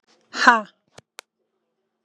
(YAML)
exhalation_length: 2.0 s
exhalation_amplitude: 32768
exhalation_signal_mean_std_ratio: 0.23
survey_phase: beta (2021-08-13 to 2022-03-07)
age: 45-64
gender: Female
wearing_mask: 'No'
symptom_none: true
smoker_status: Never smoked
respiratory_condition_asthma: false
respiratory_condition_other: false
recruitment_source: REACT
submission_delay: 1 day
covid_test_result: Negative
covid_test_method: RT-qPCR
influenza_a_test_result: Negative
influenza_b_test_result: Negative